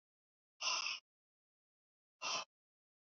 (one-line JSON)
{"exhalation_length": "3.1 s", "exhalation_amplitude": 1823, "exhalation_signal_mean_std_ratio": 0.34, "survey_phase": "beta (2021-08-13 to 2022-03-07)", "age": "65+", "gender": "Female", "wearing_mask": "No", "symptom_none": true, "smoker_status": "Ex-smoker", "respiratory_condition_asthma": false, "respiratory_condition_other": false, "recruitment_source": "REACT", "submission_delay": "2 days", "covid_test_result": "Negative", "covid_test_method": "RT-qPCR"}